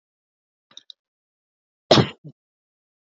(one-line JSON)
{"cough_length": "3.2 s", "cough_amplitude": 27024, "cough_signal_mean_std_ratio": 0.17, "survey_phase": "beta (2021-08-13 to 2022-03-07)", "age": "45-64", "gender": "Female", "wearing_mask": "No", "symptom_none": true, "smoker_status": "Ex-smoker", "respiratory_condition_asthma": false, "respiratory_condition_other": false, "recruitment_source": "REACT", "submission_delay": "0 days", "covid_test_result": "Negative", "covid_test_method": "RT-qPCR", "influenza_a_test_result": "Negative", "influenza_b_test_result": "Negative"}